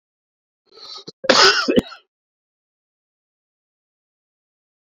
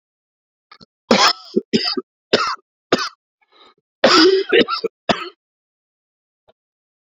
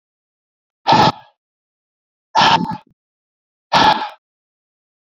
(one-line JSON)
{"cough_length": "4.9 s", "cough_amplitude": 30169, "cough_signal_mean_std_ratio": 0.25, "three_cough_length": "7.1 s", "three_cough_amplitude": 32267, "three_cough_signal_mean_std_ratio": 0.37, "exhalation_length": "5.1 s", "exhalation_amplitude": 30079, "exhalation_signal_mean_std_ratio": 0.34, "survey_phase": "beta (2021-08-13 to 2022-03-07)", "age": "45-64", "gender": "Male", "wearing_mask": "No", "symptom_cough_any": true, "symptom_runny_or_blocked_nose": true, "symptom_headache": true, "symptom_change_to_sense_of_smell_or_taste": true, "symptom_loss_of_taste": true, "symptom_onset": "6 days", "smoker_status": "Current smoker (1 to 10 cigarettes per day)", "respiratory_condition_asthma": false, "respiratory_condition_other": false, "recruitment_source": "Test and Trace", "submission_delay": "2 days", "covid_test_result": "Positive", "covid_test_method": "RT-qPCR", "covid_ct_value": 21.5, "covid_ct_gene": "N gene"}